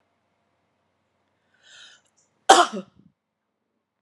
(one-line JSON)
{"cough_length": "4.0 s", "cough_amplitude": 32767, "cough_signal_mean_std_ratio": 0.17, "survey_phase": "beta (2021-08-13 to 2022-03-07)", "age": "65+", "gender": "Female", "wearing_mask": "No", "symptom_none": true, "symptom_onset": "12 days", "smoker_status": "Ex-smoker", "respiratory_condition_asthma": false, "respiratory_condition_other": false, "recruitment_source": "REACT", "submission_delay": "1 day", "covid_test_result": "Negative", "covid_test_method": "RT-qPCR"}